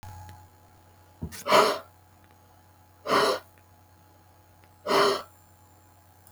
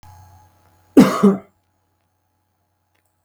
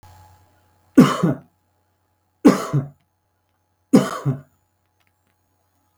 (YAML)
exhalation_length: 6.3 s
exhalation_amplitude: 17446
exhalation_signal_mean_std_ratio: 0.35
cough_length: 3.2 s
cough_amplitude: 32768
cough_signal_mean_std_ratio: 0.25
three_cough_length: 6.0 s
three_cough_amplitude: 32767
three_cough_signal_mean_std_ratio: 0.27
survey_phase: beta (2021-08-13 to 2022-03-07)
age: 45-64
gender: Male
wearing_mask: 'No'
symptom_none: true
smoker_status: Never smoked
respiratory_condition_asthma: false
respiratory_condition_other: false
recruitment_source: REACT
submission_delay: 2 days
covid_test_result: Negative
covid_test_method: RT-qPCR
influenza_a_test_result: Negative
influenza_b_test_result: Negative